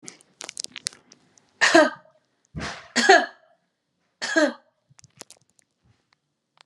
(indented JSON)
{
  "three_cough_length": "6.7 s",
  "three_cough_amplitude": 31403,
  "three_cough_signal_mean_std_ratio": 0.28,
  "survey_phase": "alpha (2021-03-01 to 2021-08-12)",
  "age": "45-64",
  "gender": "Female",
  "wearing_mask": "No",
  "symptom_none": true,
  "smoker_status": "Never smoked",
  "respiratory_condition_asthma": false,
  "respiratory_condition_other": false,
  "recruitment_source": "REACT",
  "submission_delay": "1 day",
  "covid_test_result": "Negative",
  "covid_test_method": "RT-qPCR"
}